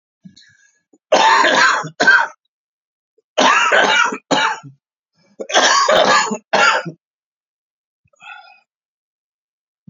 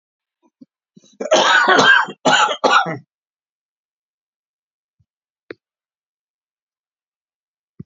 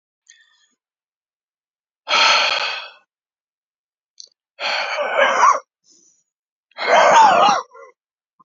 three_cough_length: 9.9 s
three_cough_amplitude: 32768
three_cough_signal_mean_std_ratio: 0.49
cough_length: 7.9 s
cough_amplitude: 32001
cough_signal_mean_std_ratio: 0.34
exhalation_length: 8.4 s
exhalation_amplitude: 28594
exhalation_signal_mean_std_ratio: 0.43
survey_phase: beta (2021-08-13 to 2022-03-07)
age: 65+
gender: Male
wearing_mask: 'No'
symptom_cough_any: true
symptom_runny_or_blocked_nose: true
symptom_shortness_of_breath: true
smoker_status: Ex-smoker
respiratory_condition_asthma: false
respiratory_condition_other: false
recruitment_source: Test and Trace
submission_delay: 1 day
covid_test_result: Negative
covid_test_method: RT-qPCR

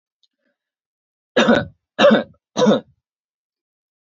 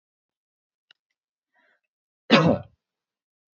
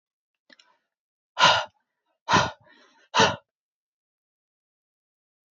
three_cough_length: 4.1 s
three_cough_amplitude: 27217
three_cough_signal_mean_std_ratio: 0.34
cough_length: 3.6 s
cough_amplitude: 25523
cough_signal_mean_std_ratio: 0.21
exhalation_length: 5.5 s
exhalation_amplitude: 20645
exhalation_signal_mean_std_ratio: 0.26
survey_phase: beta (2021-08-13 to 2022-03-07)
age: 18-44
gender: Male
wearing_mask: 'No'
symptom_none: true
smoker_status: Never smoked
respiratory_condition_asthma: false
respiratory_condition_other: false
recruitment_source: REACT
submission_delay: 1 day
covid_test_result: Negative
covid_test_method: RT-qPCR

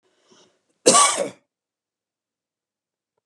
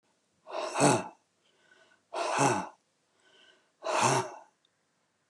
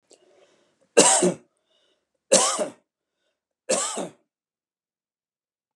cough_length: 3.3 s
cough_amplitude: 32395
cough_signal_mean_std_ratio: 0.26
exhalation_length: 5.3 s
exhalation_amplitude: 10029
exhalation_signal_mean_std_ratio: 0.41
three_cough_length: 5.8 s
three_cough_amplitude: 30560
three_cough_signal_mean_std_ratio: 0.31
survey_phase: beta (2021-08-13 to 2022-03-07)
age: 45-64
gender: Male
wearing_mask: 'No'
symptom_none: true
smoker_status: Ex-smoker
respiratory_condition_asthma: false
respiratory_condition_other: false
recruitment_source: REACT
submission_delay: 2 days
covid_test_result: Negative
covid_test_method: RT-qPCR
influenza_a_test_result: Unknown/Void
influenza_b_test_result: Unknown/Void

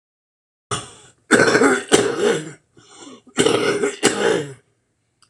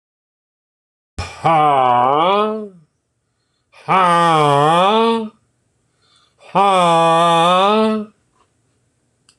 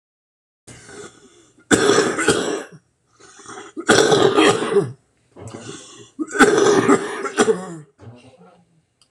cough_length: 5.3 s
cough_amplitude: 26028
cough_signal_mean_std_ratio: 0.52
exhalation_length: 9.4 s
exhalation_amplitude: 26027
exhalation_signal_mean_std_ratio: 0.59
three_cough_length: 9.1 s
three_cough_amplitude: 26028
three_cough_signal_mean_std_ratio: 0.49
survey_phase: beta (2021-08-13 to 2022-03-07)
age: 65+
gender: Male
wearing_mask: 'No'
symptom_none: true
smoker_status: Ex-smoker
respiratory_condition_asthma: false
respiratory_condition_other: true
recruitment_source: REACT
submission_delay: 4 days
covid_test_result: Negative
covid_test_method: RT-qPCR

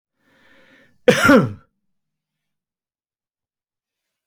cough_length: 4.3 s
cough_amplitude: 29162
cough_signal_mean_std_ratio: 0.23
survey_phase: beta (2021-08-13 to 2022-03-07)
age: 65+
gender: Male
wearing_mask: 'No'
symptom_none: true
smoker_status: Never smoked
respiratory_condition_asthma: false
respiratory_condition_other: false
recruitment_source: REACT
submission_delay: 2 days
covid_test_result: Negative
covid_test_method: RT-qPCR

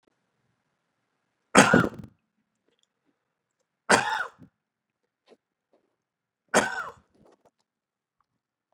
three_cough_length: 8.7 s
three_cough_amplitude: 32732
three_cough_signal_mean_std_ratio: 0.22
survey_phase: beta (2021-08-13 to 2022-03-07)
age: 18-44
gender: Male
wearing_mask: 'No'
symptom_none: true
smoker_status: Never smoked
respiratory_condition_asthma: false
respiratory_condition_other: false
recruitment_source: Test and Trace
submission_delay: 1 day
covid_test_result: Positive
covid_test_method: RT-qPCR
covid_ct_value: 29.6
covid_ct_gene: ORF1ab gene
covid_ct_mean: 30.4
covid_viral_load: 110 copies/ml
covid_viral_load_category: Minimal viral load (< 10K copies/ml)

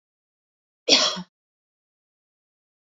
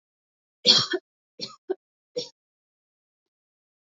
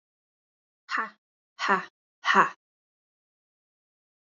cough_length: 2.8 s
cough_amplitude: 31770
cough_signal_mean_std_ratio: 0.23
three_cough_length: 3.8 s
three_cough_amplitude: 23749
three_cough_signal_mean_std_ratio: 0.23
exhalation_length: 4.3 s
exhalation_amplitude: 18365
exhalation_signal_mean_std_ratio: 0.26
survey_phase: alpha (2021-03-01 to 2021-08-12)
age: 18-44
gender: Female
wearing_mask: 'No'
symptom_none: true
smoker_status: Never smoked
respiratory_condition_asthma: false
respiratory_condition_other: false
recruitment_source: REACT
submission_delay: 1 day
covid_test_result: Negative
covid_test_method: RT-qPCR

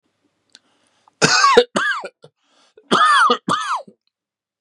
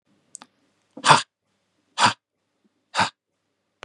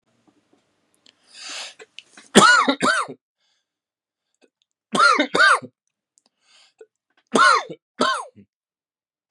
cough_length: 4.6 s
cough_amplitude: 32767
cough_signal_mean_std_ratio: 0.46
exhalation_length: 3.8 s
exhalation_amplitude: 32189
exhalation_signal_mean_std_ratio: 0.24
three_cough_length: 9.3 s
three_cough_amplitude: 32768
three_cough_signal_mean_std_ratio: 0.35
survey_phase: beta (2021-08-13 to 2022-03-07)
age: 45-64
gender: Male
wearing_mask: 'No'
symptom_cough_any: true
symptom_onset: 7 days
smoker_status: Ex-smoker
respiratory_condition_asthma: false
respiratory_condition_other: false
recruitment_source: Test and Trace
submission_delay: 1 day
covid_test_result: Positive
covid_test_method: ePCR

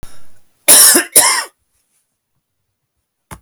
cough_length: 3.4 s
cough_amplitude: 32768
cough_signal_mean_std_ratio: 0.38
survey_phase: beta (2021-08-13 to 2022-03-07)
age: 45-64
gender: Male
wearing_mask: 'No'
symptom_none: true
smoker_status: Never smoked
respiratory_condition_asthma: false
respiratory_condition_other: false
recruitment_source: REACT
submission_delay: 6 days
covid_test_result: Negative
covid_test_method: RT-qPCR
influenza_a_test_result: Negative
influenza_b_test_result: Negative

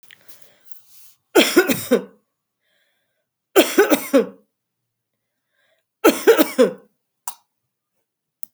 three_cough_length: 8.5 s
three_cough_amplitude: 32767
three_cough_signal_mean_std_ratio: 0.32
survey_phase: beta (2021-08-13 to 2022-03-07)
age: 65+
gender: Female
wearing_mask: 'No'
symptom_none: true
smoker_status: Ex-smoker
respiratory_condition_asthma: false
respiratory_condition_other: false
recruitment_source: REACT
submission_delay: 2 days
covid_test_result: Negative
covid_test_method: RT-qPCR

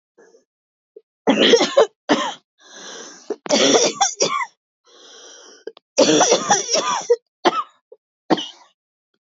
three_cough_length: 9.4 s
three_cough_amplitude: 28495
three_cough_signal_mean_std_ratio: 0.45
survey_phase: beta (2021-08-13 to 2022-03-07)
age: 45-64
gender: Female
wearing_mask: 'No'
symptom_cough_any: true
symptom_runny_or_blocked_nose: true
symptom_headache: true
symptom_onset: 2 days
smoker_status: Never smoked
respiratory_condition_asthma: false
respiratory_condition_other: false
recruitment_source: Test and Trace
submission_delay: 2 days
covid_test_result: Positive
covid_test_method: RT-qPCR
covid_ct_value: 17.8
covid_ct_gene: ORF1ab gene
covid_ct_mean: 18.1
covid_viral_load: 1100000 copies/ml
covid_viral_load_category: High viral load (>1M copies/ml)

